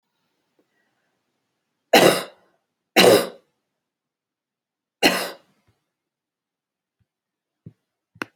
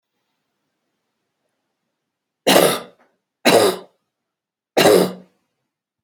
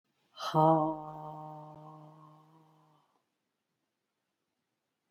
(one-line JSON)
{"cough_length": "8.4 s", "cough_amplitude": 30064, "cough_signal_mean_std_ratio": 0.23, "three_cough_length": "6.0 s", "three_cough_amplitude": 32377, "three_cough_signal_mean_std_ratio": 0.31, "exhalation_length": "5.1 s", "exhalation_amplitude": 8190, "exhalation_signal_mean_std_ratio": 0.29, "survey_phase": "beta (2021-08-13 to 2022-03-07)", "age": "65+", "gender": "Female", "wearing_mask": "No", "symptom_none": true, "smoker_status": "Never smoked", "respiratory_condition_asthma": false, "respiratory_condition_other": false, "recruitment_source": "REACT", "submission_delay": "6 days", "covid_test_result": "Negative", "covid_test_method": "RT-qPCR"}